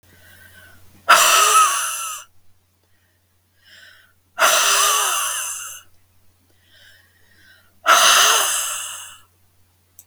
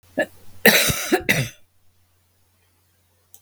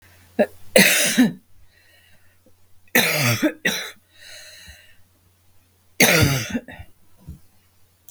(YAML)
exhalation_length: 10.1 s
exhalation_amplitude: 32768
exhalation_signal_mean_std_ratio: 0.46
cough_length: 3.4 s
cough_amplitude: 32768
cough_signal_mean_std_ratio: 0.36
three_cough_length: 8.1 s
three_cough_amplitude: 32768
three_cough_signal_mean_std_ratio: 0.41
survey_phase: beta (2021-08-13 to 2022-03-07)
age: 45-64
gender: Female
wearing_mask: 'No'
symptom_sore_throat: true
symptom_onset: 12 days
smoker_status: Never smoked
respiratory_condition_asthma: false
respiratory_condition_other: false
recruitment_source: REACT
submission_delay: 1 day
covid_test_result: Negative
covid_test_method: RT-qPCR
influenza_a_test_result: Negative
influenza_b_test_result: Negative